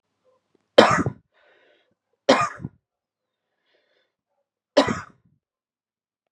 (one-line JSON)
{"three_cough_length": "6.3 s", "three_cough_amplitude": 32768, "three_cough_signal_mean_std_ratio": 0.23, "survey_phase": "beta (2021-08-13 to 2022-03-07)", "age": "18-44", "gender": "Male", "wearing_mask": "No", "symptom_cough_any": true, "symptom_new_continuous_cough": true, "symptom_runny_or_blocked_nose": true, "symptom_shortness_of_breath": true, "symptom_sore_throat": true, "symptom_fatigue": true, "symptom_fever_high_temperature": true, "symptom_headache": true, "symptom_change_to_sense_of_smell_or_taste": true, "symptom_loss_of_taste": true, "symptom_other": true, "symptom_onset": "3 days", "smoker_status": "Never smoked", "respiratory_condition_asthma": false, "respiratory_condition_other": false, "recruitment_source": "Test and Trace", "submission_delay": "2 days", "covid_test_result": "Positive", "covid_test_method": "RT-qPCR", "covid_ct_value": 15.6, "covid_ct_gene": "ORF1ab gene"}